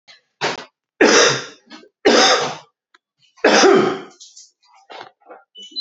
three_cough_length: 5.8 s
three_cough_amplitude: 32767
three_cough_signal_mean_std_ratio: 0.44
survey_phase: beta (2021-08-13 to 2022-03-07)
age: 18-44
gender: Male
wearing_mask: 'No'
symptom_cough_any: true
symptom_runny_or_blocked_nose: true
symptom_sore_throat: true
symptom_change_to_sense_of_smell_or_taste: true
symptom_loss_of_taste: true
symptom_onset: 5 days
smoker_status: Never smoked
respiratory_condition_asthma: true
respiratory_condition_other: false
recruitment_source: Test and Trace
submission_delay: 2 days
covid_test_result: Positive
covid_test_method: RT-qPCR
covid_ct_value: 13.0
covid_ct_gene: ORF1ab gene
covid_ct_mean: 13.4
covid_viral_load: 41000000 copies/ml
covid_viral_load_category: High viral load (>1M copies/ml)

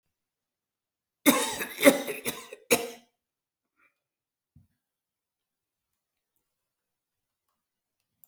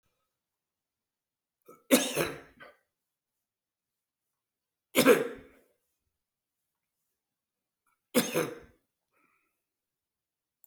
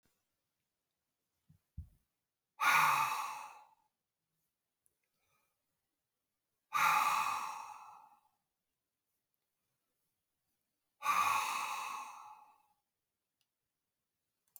cough_length: 8.3 s
cough_amplitude: 24374
cough_signal_mean_std_ratio: 0.21
three_cough_length: 10.7 s
three_cough_amplitude: 14963
three_cough_signal_mean_std_ratio: 0.22
exhalation_length: 14.6 s
exhalation_amplitude: 4887
exhalation_signal_mean_std_ratio: 0.34
survey_phase: alpha (2021-03-01 to 2021-08-12)
age: 65+
gender: Male
wearing_mask: 'No'
symptom_none: true
smoker_status: Ex-smoker
respiratory_condition_asthma: false
respiratory_condition_other: true
recruitment_source: REACT
submission_delay: 2 days
covid_test_result: Negative
covid_test_method: RT-qPCR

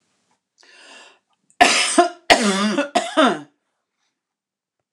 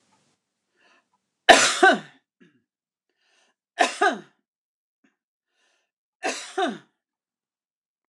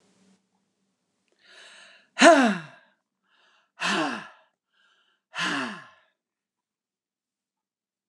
cough_length: 4.9 s
cough_amplitude: 29204
cough_signal_mean_std_ratio: 0.4
three_cough_length: 8.1 s
three_cough_amplitude: 29204
three_cough_signal_mean_std_ratio: 0.24
exhalation_length: 8.1 s
exhalation_amplitude: 28354
exhalation_signal_mean_std_ratio: 0.24
survey_phase: beta (2021-08-13 to 2022-03-07)
age: 65+
gender: Female
wearing_mask: 'No'
symptom_cough_any: true
symptom_runny_or_blocked_nose: true
symptom_onset: 12 days
smoker_status: Ex-smoker
respiratory_condition_asthma: false
respiratory_condition_other: false
recruitment_source: REACT
submission_delay: 1 day
covid_test_result: Negative
covid_test_method: RT-qPCR
influenza_a_test_result: Negative
influenza_b_test_result: Negative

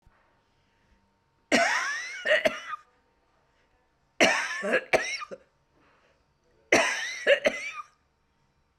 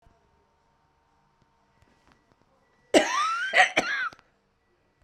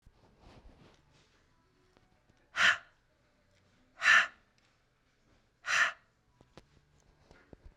three_cough_length: 8.8 s
three_cough_amplitude: 18477
three_cough_signal_mean_std_ratio: 0.41
cough_length: 5.0 s
cough_amplitude: 21590
cough_signal_mean_std_ratio: 0.33
exhalation_length: 7.8 s
exhalation_amplitude: 8581
exhalation_signal_mean_std_ratio: 0.24
survey_phase: beta (2021-08-13 to 2022-03-07)
age: 45-64
gender: Female
wearing_mask: 'Yes'
symptom_none: true
smoker_status: Ex-smoker
respiratory_condition_asthma: false
respiratory_condition_other: false
recruitment_source: REACT
submission_delay: 1 day
covid_test_result: Negative
covid_test_method: RT-qPCR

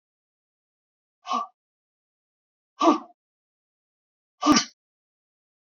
exhalation_length: 5.7 s
exhalation_amplitude: 20006
exhalation_signal_mean_std_ratio: 0.23
survey_phase: beta (2021-08-13 to 2022-03-07)
age: 45-64
gender: Female
wearing_mask: 'No'
symptom_none: true
smoker_status: Never smoked
respiratory_condition_asthma: false
respiratory_condition_other: false
recruitment_source: REACT
submission_delay: 1 day
covid_test_result: Negative
covid_test_method: RT-qPCR
influenza_a_test_result: Negative
influenza_b_test_result: Negative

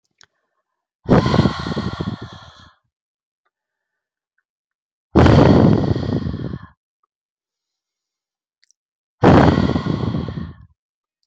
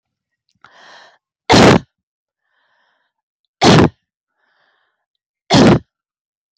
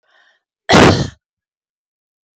exhalation_length: 11.3 s
exhalation_amplitude: 32050
exhalation_signal_mean_std_ratio: 0.39
three_cough_length: 6.6 s
three_cough_amplitude: 32768
three_cough_signal_mean_std_ratio: 0.31
cough_length: 2.4 s
cough_amplitude: 32521
cough_signal_mean_std_ratio: 0.32
survey_phase: beta (2021-08-13 to 2022-03-07)
age: 45-64
gender: Female
wearing_mask: 'No'
symptom_runny_or_blocked_nose: true
symptom_headache: true
symptom_change_to_sense_of_smell_or_taste: true
symptom_onset: 2 days
smoker_status: Never smoked
respiratory_condition_asthma: false
respiratory_condition_other: false
recruitment_source: Test and Trace
submission_delay: 2 days
covid_test_result: Positive
covid_test_method: RT-qPCR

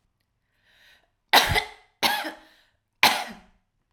three_cough_length: 3.9 s
three_cough_amplitude: 32767
three_cough_signal_mean_std_ratio: 0.32
survey_phase: alpha (2021-03-01 to 2021-08-12)
age: 18-44
gender: Female
wearing_mask: 'No'
symptom_none: true
smoker_status: Current smoker (11 or more cigarettes per day)
respiratory_condition_asthma: false
respiratory_condition_other: false
recruitment_source: REACT
submission_delay: 1 day
covid_test_result: Negative
covid_test_method: RT-qPCR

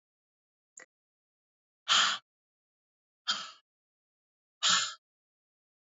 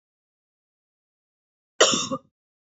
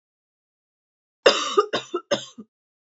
exhalation_length: 5.9 s
exhalation_amplitude: 7407
exhalation_signal_mean_std_ratio: 0.26
cough_length: 2.7 s
cough_amplitude: 24855
cough_signal_mean_std_ratio: 0.24
three_cough_length: 2.9 s
three_cough_amplitude: 27174
three_cough_signal_mean_std_ratio: 0.3
survey_phase: beta (2021-08-13 to 2022-03-07)
age: 18-44
gender: Female
wearing_mask: 'No'
symptom_cough_any: true
symptom_runny_or_blocked_nose: true
symptom_sore_throat: true
symptom_fatigue: true
symptom_headache: true
smoker_status: Never smoked
respiratory_condition_asthma: false
respiratory_condition_other: false
recruitment_source: Test and Trace
submission_delay: 2 days
covid_test_result: Positive
covid_test_method: RT-qPCR
covid_ct_value: 23.9
covid_ct_gene: ORF1ab gene
covid_ct_mean: 25.3
covid_viral_load: 5200 copies/ml
covid_viral_load_category: Minimal viral load (< 10K copies/ml)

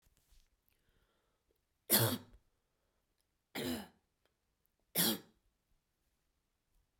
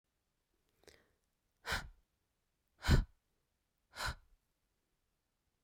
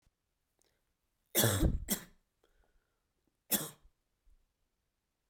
three_cough_length: 7.0 s
three_cough_amplitude: 5853
three_cough_signal_mean_std_ratio: 0.25
exhalation_length: 5.6 s
exhalation_amplitude: 4935
exhalation_signal_mean_std_ratio: 0.21
cough_length: 5.3 s
cough_amplitude: 7093
cough_signal_mean_std_ratio: 0.28
survey_phase: beta (2021-08-13 to 2022-03-07)
age: 18-44
gender: Female
wearing_mask: 'No'
symptom_runny_or_blocked_nose: true
symptom_onset: 8 days
smoker_status: Never smoked
respiratory_condition_asthma: false
respiratory_condition_other: false
recruitment_source: REACT
submission_delay: 1 day
covid_test_result: Negative
covid_test_method: RT-qPCR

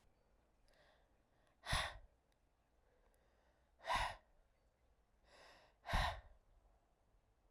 exhalation_length: 7.5 s
exhalation_amplitude: 1734
exhalation_signal_mean_std_ratio: 0.3
survey_phase: beta (2021-08-13 to 2022-03-07)
age: 18-44
gender: Female
wearing_mask: 'No'
symptom_cough_any: true
symptom_runny_or_blocked_nose: true
symptom_diarrhoea: true
symptom_fatigue: true
symptom_loss_of_taste: true
symptom_onset: 3 days
smoker_status: Never smoked
respiratory_condition_asthma: false
respiratory_condition_other: false
recruitment_source: Test and Trace
submission_delay: 1 day
covid_test_result: Positive
covid_test_method: RT-qPCR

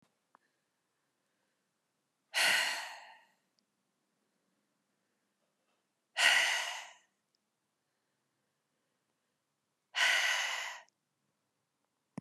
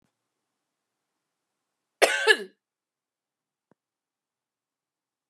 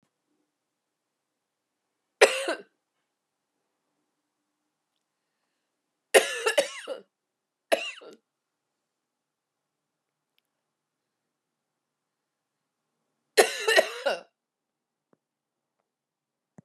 exhalation_length: 12.2 s
exhalation_amplitude: 8843
exhalation_signal_mean_std_ratio: 0.31
cough_length: 5.3 s
cough_amplitude: 25349
cough_signal_mean_std_ratio: 0.17
three_cough_length: 16.6 s
three_cough_amplitude: 27116
three_cough_signal_mean_std_ratio: 0.2
survey_phase: beta (2021-08-13 to 2022-03-07)
age: 45-64
gender: Female
wearing_mask: 'No'
symptom_cough_any: true
symptom_new_continuous_cough: true
symptom_runny_or_blocked_nose: true
symptom_sore_throat: true
symptom_fatigue: true
symptom_headache: true
symptom_other: true
symptom_onset: 3 days
smoker_status: Never smoked
respiratory_condition_asthma: false
respiratory_condition_other: false
recruitment_source: Test and Trace
submission_delay: 2 days
covid_test_result: Positive
covid_test_method: RT-qPCR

